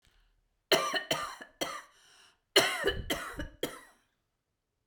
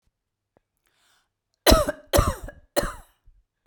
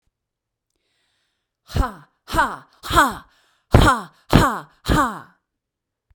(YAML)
cough_length: 4.9 s
cough_amplitude: 11868
cough_signal_mean_std_ratio: 0.4
three_cough_length: 3.7 s
three_cough_amplitude: 29483
three_cough_signal_mean_std_ratio: 0.29
exhalation_length: 6.1 s
exhalation_amplitude: 32768
exhalation_signal_mean_std_ratio: 0.36
survey_phase: beta (2021-08-13 to 2022-03-07)
age: 65+
gender: Female
wearing_mask: 'No'
symptom_cough_any: true
symptom_runny_or_blocked_nose: true
symptom_onset: 9 days
smoker_status: Ex-smoker
respiratory_condition_asthma: false
respiratory_condition_other: false
recruitment_source: REACT
submission_delay: 1 day
covid_test_result: Negative
covid_test_method: RT-qPCR
influenza_a_test_result: Negative
influenza_b_test_result: Negative